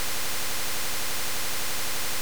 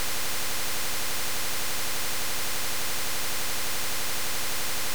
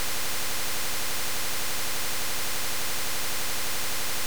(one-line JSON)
{"cough_length": "2.2 s", "cough_amplitude": 3254, "cough_signal_mean_std_ratio": 1.81, "exhalation_length": "4.9 s", "exhalation_amplitude": 3254, "exhalation_signal_mean_std_ratio": 1.81, "three_cough_length": "4.3 s", "three_cough_amplitude": 3254, "three_cough_signal_mean_std_ratio": 1.81, "survey_phase": "beta (2021-08-13 to 2022-03-07)", "age": "65+", "gender": "Male", "wearing_mask": "No", "symptom_cough_any": true, "smoker_status": "Ex-smoker", "respiratory_condition_asthma": false, "respiratory_condition_other": true, "recruitment_source": "REACT", "submission_delay": "1 day", "covid_test_result": "Negative", "covid_test_method": "RT-qPCR"}